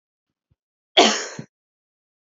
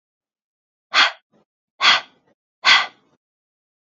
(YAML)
cough_length: 2.2 s
cough_amplitude: 29874
cough_signal_mean_std_ratio: 0.25
exhalation_length: 3.8 s
exhalation_amplitude: 29880
exhalation_signal_mean_std_ratio: 0.3
survey_phase: alpha (2021-03-01 to 2021-08-12)
age: 18-44
gender: Female
wearing_mask: 'No'
symptom_cough_any: true
symptom_shortness_of_breath: true
symptom_fatigue: true
symptom_headache: true
symptom_onset: 4 days
smoker_status: Never smoked
respiratory_condition_asthma: true
respiratory_condition_other: false
recruitment_source: Test and Trace
submission_delay: 2 days
covid_test_result: Positive
covid_test_method: RT-qPCR
covid_ct_value: 14.9
covid_ct_gene: ORF1ab gene
covid_ct_mean: 15.0
covid_viral_load: 12000000 copies/ml
covid_viral_load_category: High viral load (>1M copies/ml)